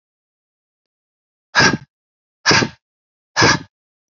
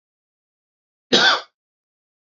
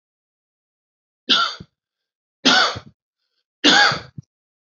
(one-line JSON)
{"exhalation_length": "4.1 s", "exhalation_amplitude": 31295, "exhalation_signal_mean_std_ratio": 0.31, "cough_length": "2.4 s", "cough_amplitude": 32767, "cough_signal_mean_std_ratio": 0.27, "three_cough_length": "4.8 s", "three_cough_amplitude": 29107, "three_cough_signal_mean_std_ratio": 0.34, "survey_phase": "alpha (2021-03-01 to 2021-08-12)", "age": "18-44", "gender": "Male", "wearing_mask": "No", "symptom_none": true, "smoker_status": "Never smoked", "respiratory_condition_asthma": false, "respiratory_condition_other": false, "recruitment_source": "REACT", "submission_delay": "1 day", "covid_test_result": "Negative", "covid_test_method": "RT-qPCR"}